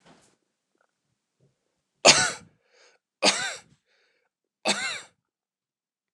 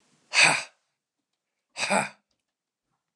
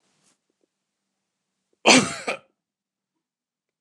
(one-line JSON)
{"three_cough_length": "6.1 s", "three_cough_amplitude": 29040, "three_cough_signal_mean_std_ratio": 0.24, "exhalation_length": "3.2 s", "exhalation_amplitude": 22650, "exhalation_signal_mean_std_ratio": 0.3, "cough_length": "3.8 s", "cough_amplitude": 29203, "cough_signal_mean_std_ratio": 0.21, "survey_phase": "alpha (2021-03-01 to 2021-08-12)", "age": "45-64", "gender": "Male", "wearing_mask": "No", "symptom_none": true, "smoker_status": "Ex-smoker", "respiratory_condition_asthma": false, "respiratory_condition_other": false, "recruitment_source": "REACT", "submission_delay": "2 days", "covid_test_result": "Negative", "covid_test_method": "RT-qPCR"}